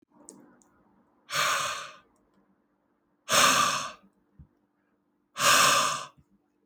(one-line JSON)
{"exhalation_length": "6.7 s", "exhalation_amplitude": 13473, "exhalation_signal_mean_std_ratio": 0.41, "survey_phase": "alpha (2021-03-01 to 2021-08-12)", "age": "18-44", "gender": "Male", "wearing_mask": "No", "symptom_cough_any": true, "smoker_status": "Ex-smoker", "respiratory_condition_asthma": false, "respiratory_condition_other": false, "recruitment_source": "Test and Trace", "submission_delay": "7 days", "covid_test_result": "Positive", "covid_test_method": "RT-qPCR", "covid_ct_value": 37.3, "covid_ct_gene": "N gene"}